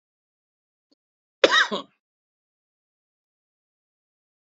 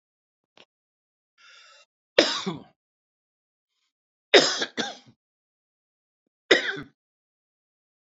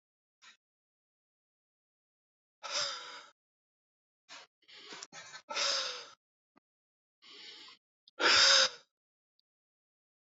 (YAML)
cough_length: 4.4 s
cough_amplitude: 28717
cough_signal_mean_std_ratio: 0.18
three_cough_length: 8.0 s
three_cough_amplitude: 28431
three_cough_signal_mean_std_ratio: 0.22
exhalation_length: 10.2 s
exhalation_amplitude: 8627
exhalation_signal_mean_std_ratio: 0.27
survey_phase: beta (2021-08-13 to 2022-03-07)
age: 45-64
gender: Male
wearing_mask: 'No'
symptom_none: true
smoker_status: Never smoked
respiratory_condition_asthma: false
respiratory_condition_other: false
recruitment_source: REACT
submission_delay: 1 day
covid_test_result: Negative
covid_test_method: RT-qPCR
influenza_a_test_result: Negative
influenza_b_test_result: Negative